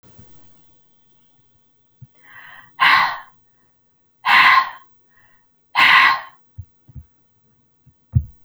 {"exhalation_length": "8.4 s", "exhalation_amplitude": 32767, "exhalation_signal_mean_std_ratio": 0.33, "survey_phase": "alpha (2021-03-01 to 2021-08-12)", "age": "18-44", "gender": "Female", "wearing_mask": "No", "symptom_none": true, "smoker_status": "Never smoked", "respiratory_condition_asthma": false, "respiratory_condition_other": false, "recruitment_source": "REACT", "submission_delay": "1 day", "covid_test_result": "Negative", "covid_test_method": "RT-qPCR"}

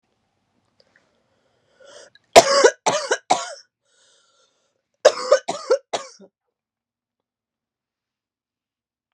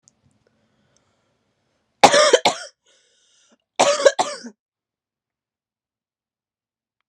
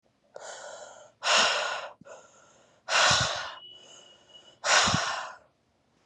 {"three_cough_length": "9.1 s", "three_cough_amplitude": 32768, "three_cough_signal_mean_std_ratio": 0.24, "cough_length": "7.1 s", "cough_amplitude": 32768, "cough_signal_mean_std_ratio": 0.25, "exhalation_length": "6.1 s", "exhalation_amplitude": 12846, "exhalation_signal_mean_std_ratio": 0.47, "survey_phase": "beta (2021-08-13 to 2022-03-07)", "age": "18-44", "gender": "Female", "wearing_mask": "No", "symptom_cough_any": true, "symptom_new_continuous_cough": true, "symptom_runny_or_blocked_nose": true, "symptom_fatigue": true, "smoker_status": "Current smoker (e-cigarettes or vapes only)", "respiratory_condition_asthma": false, "respiratory_condition_other": false, "recruitment_source": "Test and Trace", "submission_delay": "2 days", "covid_test_result": "Positive", "covid_test_method": "RT-qPCR", "covid_ct_value": 17.7, "covid_ct_gene": "ORF1ab gene", "covid_ct_mean": 17.9, "covid_viral_load": "1300000 copies/ml", "covid_viral_load_category": "High viral load (>1M copies/ml)"}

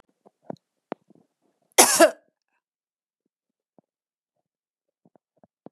{"cough_length": "5.7 s", "cough_amplitude": 32767, "cough_signal_mean_std_ratio": 0.17, "survey_phase": "beta (2021-08-13 to 2022-03-07)", "age": "45-64", "gender": "Female", "wearing_mask": "No", "symptom_none": true, "smoker_status": "Never smoked", "respiratory_condition_asthma": false, "respiratory_condition_other": false, "recruitment_source": "REACT", "submission_delay": "1 day", "covid_test_result": "Negative", "covid_test_method": "RT-qPCR", "influenza_a_test_result": "Negative", "influenza_b_test_result": "Negative"}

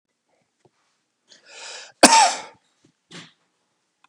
{"cough_length": "4.1 s", "cough_amplitude": 32768, "cough_signal_mean_std_ratio": 0.23, "survey_phase": "beta (2021-08-13 to 2022-03-07)", "age": "65+", "gender": "Male", "wearing_mask": "No", "symptom_runny_or_blocked_nose": true, "smoker_status": "Ex-smoker", "respiratory_condition_asthma": false, "respiratory_condition_other": true, "recruitment_source": "REACT", "submission_delay": "3 days", "covid_test_result": "Negative", "covid_test_method": "RT-qPCR", "influenza_a_test_result": "Negative", "influenza_b_test_result": "Negative"}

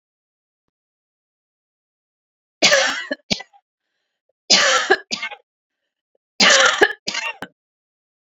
{"three_cough_length": "8.3 s", "three_cough_amplitude": 32767, "three_cough_signal_mean_std_ratio": 0.34, "survey_phase": "beta (2021-08-13 to 2022-03-07)", "age": "45-64", "gender": "Female", "wearing_mask": "No", "symptom_cough_any": true, "symptom_sore_throat": true, "symptom_diarrhoea": true, "smoker_status": "Ex-smoker", "respiratory_condition_asthma": false, "respiratory_condition_other": false, "recruitment_source": "Test and Trace", "submission_delay": "2 days", "covid_test_result": "Positive", "covid_test_method": "RT-qPCR", "covid_ct_value": 34.4, "covid_ct_gene": "ORF1ab gene", "covid_ct_mean": 34.4, "covid_viral_load": "5.3 copies/ml", "covid_viral_load_category": "Minimal viral load (< 10K copies/ml)"}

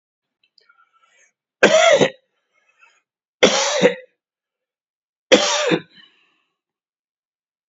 {"three_cough_length": "7.7 s", "three_cough_amplitude": 30075, "three_cough_signal_mean_std_ratio": 0.33, "survey_phase": "beta (2021-08-13 to 2022-03-07)", "age": "45-64", "gender": "Male", "wearing_mask": "No", "symptom_runny_or_blocked_nose": true, "symptom_fatigue": true, "smoker_status": "Ex-smoker", "respiratory_condition_asthma": false, "respiratory_condition_other": false, "recruitment_source": "Test and Trace", "submission_delay": "1 day", "covid_test_result": "Positive", "covid_test_method": "RT-qPCR", "covid_ct_value": 25.2, "covid_ct_gene": "N gene"}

